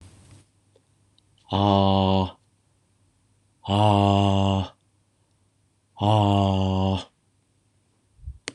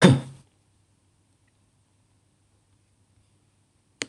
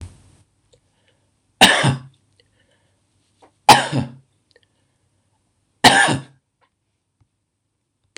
{"exhalation_length": "8.5 s", "exhalation_amplitude": 16746, "exhalation_signal_mean_std_ratio": 0.47, "cough_length": "4.1 s", "cough_amplitude": 26027, "cough_signal_mean_std_ratio": 0.17, "three_cough_length": "8.2 s", "three_cough_amplitude": 26028, "three_cough_signal_mean_std_ratio": 0.26, "survey_phase": "beta (2021-08-13 to 2022-03-07)", "age": "45-64", "gender": "Male", "wearing_mask": "No", "symptom_none": true, "smoker_status": "Never smoked", "respiratory_condition_asthma": false, "respiratory_condition_other": false, "recruitment_source": "REACT", "submission_delay": "3 days", "covid_test_result": "Negative", "covid_test_method": "RT-qPCR", "influenza_a_test_result": "Negative", "influenza_b_test_result": "Negative"}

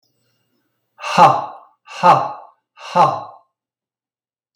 {"exhalation_length": "4.6 s", "exhalation_amplitude": 32768, "exhalation_signal_mean_std_ratio": 0.35, "survey_phase": "beta (2021-08-13 to 2022-03-07)", "age": "45-64", "gender": "Male", "wearing_mask": "No", "symptom_none": true, "smoker_status": "Never smoked", "respiratory_condition_asthma": false, "respiratory_condition_other": false, "recruitment_source": "REACT", "submission_delay": "0 days", "covid_test_result": "Negative", "covid_test_method": "RT-qPCR", "influenza_a_test_result": "Negative", "influenza_b_test_result": "Negative"}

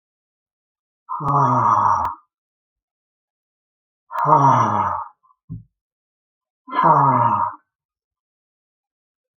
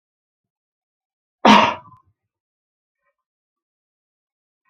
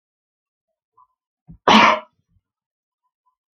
{"exhalation_length": "9.4 s", "exhalation_amplitude": 32658, "exhalation_signal_mean_std_ratio": 0.44, "cough_length": "4.7 s", "cough_amplitude": 29158, "cough_signal_mean_std_ratio": 0.19, "three_cough_length": "3.6 s", "three_cough_amplitude": 31053, "three_cough_signal_mean_std_ratio": 0.23, "survey_phase": "beta (2021-08-13 to 2022-03-07)", "age": "65+", "gender": "Male", "wearing_mask": "No", "symptom_none": true, "smoker_status": "Never smoked", "respiratory_condition_asthma": false, "respiratory_condition_other": false, "recruitment_source": "REACT", "submission_delay": "5 days", "covid_test_result": "Negative", "covid_test_method": "RT-qPCR"}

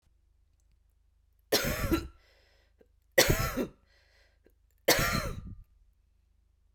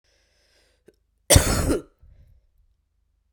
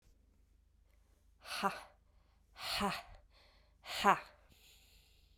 {"three_cough_length": "6.7 s", "three_cough_amplitude": 15696, "three_cough_signal_mean_std_ratio": 0.36, "cough_length": "3.3 s", "cough_amplitude": 32768, "cough_signal_mean_std_ratio": 0.27, "exhalation_length": "5.4 s", "exhalation_amplitude": 6551, "exhalation_signal_mean_std_ratio": 0.31, "survey_phase": "beta (2021-08-13 to 2022-03-07)", "age": "18-44", "gender": "Female", "wearing_mask": "No", "symptom_runny_or_blocked_nose": true, "symptom_shortness_of_breath": true, "symptom_fatigue": true, "symptom_headache": true, "symptom_change_to_sense_of_smell_or_taste": true, "symptom_loss_of_taste": true, "symptom_onset": "3 days", "smoker_status": "Ex-smoker", "respiratory_condition_asthma": false, "respiratory_condition_other": false, "recruitment_source": "REACT", "submission_delay": "2 days", "covid_test_result": "Positive", "covid_test_method": "RT-qPCR", "covid_ct_value": 19.0, "covid_ct_gene": "E gene"}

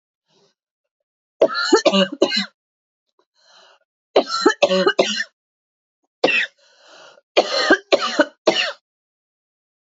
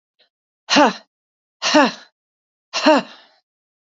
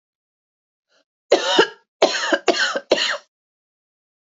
{"three_cough_length": "9.8 s", "three_cough_amplitude": 29741, "three_cough_signal_mean_std_ratio": 0.39, "exhalation_length": "3.8 s", "exhalation_amplitude": 28260, "exhalation_signal_mean_std_ratio": 0.34, "cough_length": "4.3 s", "cough_amplitude": 30080, "cough_signal_mean_std_ratio": 0.39, "survey_phase": "beta (2021-08-13 to 2022-03-07)", "age": "45-64", "gender": "Female", "wearing_mask": "No", "symptom_new_continuous_cough": true, "symptom_runny_or_blocked_nose": true, "symptom_shortness_of_breath": true, "symptom_sore_throat": true, "symptom_fatigue": true, "symptom_headache": true, "symptom_change_to_sense_of_smell_or_taste": true, "symptom_loss_of_taste": true, "smoker_status": "Ex-smoker", "respiratory_condition_asthma": false, "respiratory_condition_other": false, "recruitment_source": "Test and Trace", "submission_delay": "2 days", "covid_test_result": "Positive", "covid_test_method": "RT-qPCR", "covid_ct_value": 13.7, "covid_ct_gene": "ORF1ab gene"}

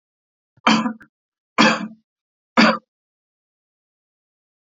{"three_cough_length": "4.6 s", "three_cough_amplitude": 28812, "three_cough_signal_mean_std_ratio": 0.3, "survey_phase": "beta (2021-08-13 to 2022-03-07)", "age": "45-64", "gender": "Male", "wearing_mask": "No", "symptom_none": true, "symptom_onset": "7 days", "smoker_status": "Ex-smoker", "respiratory_condition_asthma": false, "respiratory_condition_other": false, "recruitment_source": "REACT", "submission_delay": "2 days", "covid_test_result": "Negative", "covid_test_method": "RT-qPCR"}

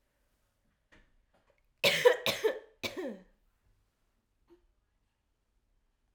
{"cough_length": "6.1 s", "cough_amplitude": 11106, "cough_signal_mean_std_ratio": 0.25, "survey_phase": "alpha (2021-03-01 to 2021-08-12)", "age": "18-44", "gender": "Female", "wearing_mask": "No", "symptom_cough_any": true, "symptom_onset": "4 days", "smoker_status": "Never smoked", "respiratory_condition_asthma": false, "respiratory_condition_other": false, "recruitment_source": "Test and Trace", "submission_delay": "2 days", "covid_test_result": "Positive", "covid_test_method": "ePCR"}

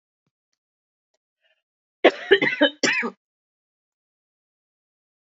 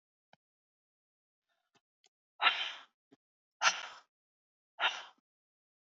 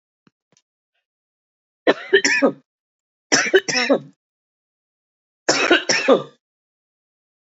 {"cough_length": "5.2 s", "cough_amplitude": 28301, "cough_signal_mean_std_ratio": 0.25, "exhalation_length": "6.0 s", "exhalation_amplitude": 7416, "exhalation_signal_mean_std_ratio": 0.24, "three_cough_length": "7.5 s", "three_cough_amplitude": 29025, "three_cough_signal_mean_std_ratio": 0.35, "survey_phase": "beta (2021-08-13 to 2022-03-07)", "age": "65+", "gender": "Female", "wearing_mask": "No", "symptom_cough_any": true, "symptom_runny_or_blocked_nose": true, "symptom_onset": "8 days", "smoker_status": "Never smoked", "respiratory_condition_asthma": false, "respiratory_condition_other": false, "recruitment_source": "REACT", "submission_delay": "2 days", "covid_test_result": "Negative", "covid_test_method": "RT-qPCR", "influenza_a_test_result": "Negative", "influenza_b_test_result": "Negative"}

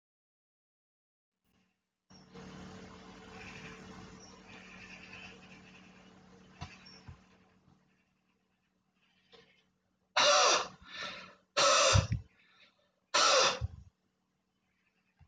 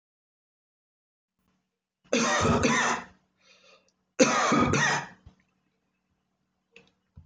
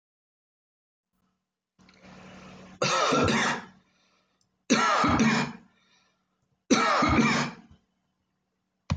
{"exhalation_length": "15.3 s", "exhalation_amplitude": 6776, "exhalation_signal_mean_std_ratio": 0.31, "cough_length": "7.3 s", "cough_amplitude": 14328, "cough_signal_mean_std_ratio": 0.41, "three_cough_length": "9.0 s", "three_cough_amplitude": 12290, "three_cough_signal_mean_std_ratio": 0.46, "survey_phase": "alpha (2021-03-01 to 2021-08-12)", "age": "65+", "gender": "Male", "wearing_mask": "No", "symptom_none": true, "symptom_abdominal_pain": true, "smoker_status": "Never smoked", "respiratory_condition_asthma": false, "respiratory_condition_other": false, "recruitment_source": "REACT", "submission_delay": "1 day", "covid_test_result": "Negative", "covid_test_method": "RT-qPCR"}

